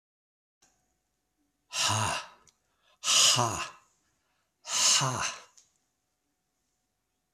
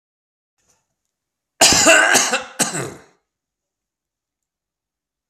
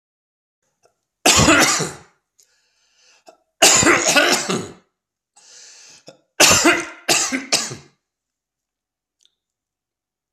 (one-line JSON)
{"exhalation_length": "7.3 s", "exhalation_amplitude": 11466, "exhalation_signal_mean_std_ratio": 0.38, "cough_length": "5.3 s", "cough_amplitude": 32768, "cough_signal_mean_std_ratio": 0.34, "three_cough_length": "10.3 s", "three_cough_amplitude": 32768, "three_cough_signal_mean_std_ratio": 0.39, "survey_phase": "beta (2021-08-13 to 2022-03-07)", "age": "65+", "gender": "Male", "wearing_mask": "No", "symptom_cough_any": true, "symptom_onset": "13 days", "smoker_status": "Never smoked", "respiratory_condition_asthma": false, "respiratory_condition_other": false, "recruitment_source": "REACT", "submission_delay": "1 day", "covid_test_result": "Negative", "covid_test_method": "RT-qPCR", "influenza_a_test_result": "Negative", "influenza_b_test_result": "Negative"}